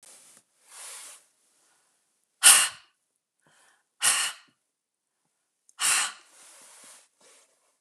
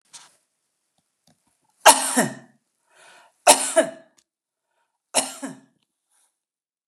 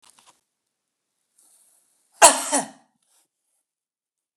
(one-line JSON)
{"exhalation_length": "7.8 s", "exhalation_amplitude": 30258, "exhalation_signal_mean_std_ratio": 0.25, "three_cough_length": "6.9 s", "three_cough_amplitude": 31960, "three_cough_signal_mean_std_ratio": 0.24, "cough_length": "4.4 s", "cough_amplitude": 32768, "cough_signal_mean_std_ratio": 0.18, "survey_phase": "beta (2021-08-13 to 2022-03-07)", "age": "65+", "gender": "Female", "wearing_mask": "No", "symptom_none": true, "smoker_status": "Never smoked", "respiratory_condition_asthma": false, "respiratory_condition_other": false, "recruitment_source": "REACT", "submission_delay": "1 day", "covid_test_result": "Negative", "covid_test_method": "RT-qPCR", "influenza_a_test_result": "Negative", "influenza_b_test_result": "Negative"}